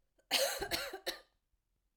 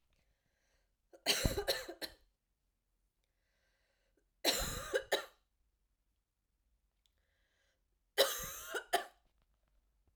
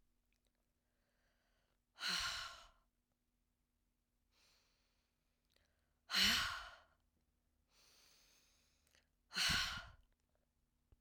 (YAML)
cough_length: 2.0 s
cough_amplitude: 5147
cough_signal_mean_std_ratio: 0.46
three_cough_length: 10.2 s
three_cough_amplitude: 5868
three_cough_signal_mean_std_ratio: 0.31
exhalation_length: 11.0 s
exhalation_amplitude: 3325
exhalation_signal_mean_std_ratio: 0.29
survey_phase: beta (2021-08-13 to 2022-03-07)
age: 45-64
gender: Female
wearing_mask: 'No'
symptom_cough_any: true
symptom_runny_or_blocked_nose: true
symptom_sore_throat: true
symptom_onset: 5 days
smoker_status: Never smoked
respiratory_condition_asthma: false
respiratory_condition_other: false
recruitment_source: Test and Trace
submission_delay: 2 days
covid_test_result: Positive
covid_test_method: RT-qPCR
covid_ct_value: 15.3
covid_ct_gene: ORF1ab gene
covid_ct_mean: 15.6
covid_viral_load: 7400000 copies/ml
covid_viral_load_category: High viral load (>1M copies/ml)